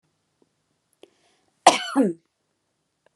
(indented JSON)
{
  "cough_length": "3.2 s",
  "cough_amplitude": 32645,
  "cough_signal_mean_std_ratio": 0.23,
  "survey_phase": "beta (2021-08-13 to 2022-03-07)",
  "age": "18-44",
  "gender": "Female",
  "wearing_mask": "No",
  "symptom_none": true,
  "smoker_status": "Never smoked",
  "respiratory_condition_asthma": false,
  "respiratory_condition_other": false,
  "recruitment_source": "REACT",
  "submission_delay": "3 days",
  "covid_test_result": "Negative",
  "covid_test_method": "RT-qPCR"
}